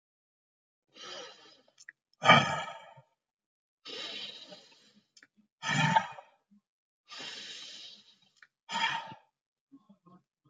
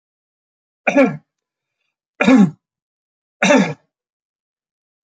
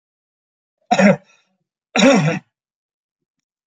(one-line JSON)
{"exhalation_length": "10.5 s", "exhalation_amplitude": 15334, "exhalation_signal_mean_std_ratio": 0.28, "three_cough_length": "5.0 s", "three_cough_amplitude": 29141, "three_cough_signal_mean_std_ratio": 0.32, "cough_length": "3.7 s", "cough_amplitude": 28640, "cough_signal_mean_std_ratio": 0.34, "survey_phase": "alpha (2021-03-01 to 2021-08-12)", "age": "65+", "gender": "Male", "wearing_mask": "No", "symptom_none": true, "smoker_status": "Never smoked", "respiratory_condition_asthma": false, "respiratory_condition_other": false, "recruitment_source": "REACT", "submission_delay": "1 day", "covid_test_result": "Negative", "covid_test_method": "RT-qPCR"}